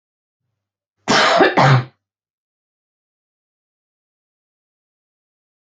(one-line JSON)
{"cough_length": "5.6 s", "cough_amplitude": 29303, "cough_signal_mean_std_ratio": 0.29, "survey_phase": "beta (2021-08-13 to 2022-03-07)", "age": "45-64", "gender": "Female", "wearing_mask": "No", "symptom_cough_any": true, "symptom_headache": true, "symptom_change_to_sense_of_smell_or_taste": true, "symptom_loss_of_taste": true, "smoker_status": "Ex-smoker", "respiratory_condition_asthma": false, "respiratory_condition_other": false, "recruitment_source": "REACT", "submission_delay": "9 days", "covid_test_result": "Negative", "covid_test_method": "RT-qPCR"}